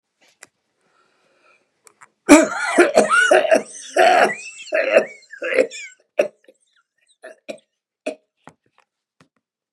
{"cough_length": "9.7 s", "cough_amplitude": 32768, "cough_signal_mean_std_ratio": 0.37, "survey_phase": "beta (2021-08-13 to 2022-03-07)", "age": "65+", "gender": "Male", "wearing_mask": "No", "symptom_cough_any": true, "symptom_onset": "12 days", "smoker_status": "Never smoked", "respiratory_condition_asthma": true, "respiratory_condition_other": false, "recruitment_source": "REACT", "submission_delay": "2 days", "covid_test_result": "Negative", "covid_test_method": "RT-qPCR", "influenza_a_test_result": "Negative", "influenza_b_test_result": "Negative"}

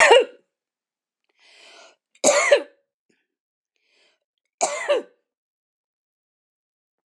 {"three_cough_length": "7.1 s", "three_cough_amplitude": 26027, "three_cough_signal_mean_std_ratio": 0.27, "survey_phase": "alpha (2021-03-01 to 2021-08-12)", "age": "65+", "gender": "Female", "wearing_mask": "No", "symptom_none": true, "smoker_status": "Ex-smoker", "respiratory_condition_asthma": false, "respiratory_condition_other": false, "recruitment_source": "REACT", "submission_delay": "2 days", "covid_test_result": "Negative", "covid_test_method": "RT-qPCR"}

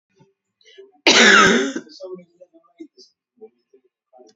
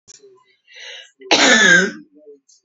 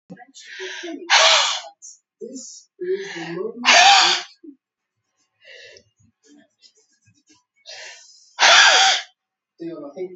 {"cough_length": "4.4 s", "cough_amplitude": 32768, "cough_signal_mean_std_ratio": 0.33, "three_cough_length": "2.6 s", "three_cough_amplitude": 32266, "three_cough_signal_mean_std_ratio": 0.43, "exhalation_length": "10.2 s", "exhalation_amplitude": 32767, "exhalation_signal_mean_std_ratio": 0.4, "survey_phase": "beta (2021-08-13 to 2022-03-07)", "age": "65+", "gender": "Female", "wearing_mask": "No", "symptom_none": true, "smoker_status": "Ex-smoker", "respiratory_condition_asthma": false, "respiratory_condition_other": false, "recruitment_source": "REACT", "submission_delay": "1 day", "covid_test_result": "Negative", "covid_test_method": "RT-qPCR"}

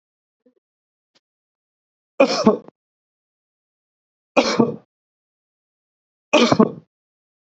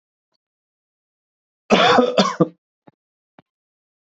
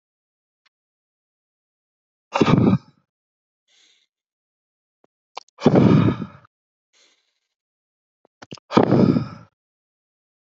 {"three_cough_length": "7.5 s", "three_cough_amplitude": 28751, "three_cough_signal_mean_std_ratio": 0.26, "cough_length": "4.1 s", "cough_amplitude": 28350, "cough_signal_mean_std_ratio": 0.31, "exhalation_length": "10.5 s", "exhalation_amplitude": 27509, "exhalation_signal_mean_std_ratio": 0.29, "survey_phase": "beta (2021-08-13 to 2022-03-07)", "age": "45-64", "gender": "Male", "wearing_mask": "No", "symptom_none": true, "smoker_status": "Ex-smoker", "respiratory_condition_asthma": false, "respiratory_condition_other": false, "recruitment_source": "Test and Trace", "submission_delay": "1 day", "covid_test_result": "Negative", "covid_test_method": "ePCR"}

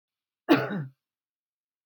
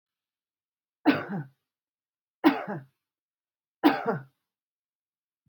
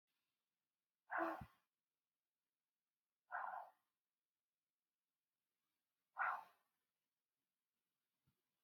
{"cough_length": "1.9 s", "cough_amplitude": 13404, "cough_signal_mean_std_ratio": 0.29, "three_cough_length": "5.5 s", "three_cough_amplitude": 15884, "three_cough_signal_mean_std_ratio": 0.27, "exhalation_length": "8.6 s", "exhalation_amplitude": 1124, "exhalation_signal_mean_std_ratio": 0.24, "survey_phase": "beta (2021-08-13 to 2022-03-07)", "age": "45-64", "gender": "Female", "wearing_mask": "No", "symptom_none": true, "smoker_status": "Ex-smoker", "respiratory_condition_asthma": false, "respiratory_condition_other": false, "recruitment_source": "REACT", "submission_delay": "2 days", "covid_test_result": "Negative", "covid_test_method": "RT-qPCR", "influenza_a_test_result": "Unknown/Void", "influenza_b_test_result": "Unknown/Void"}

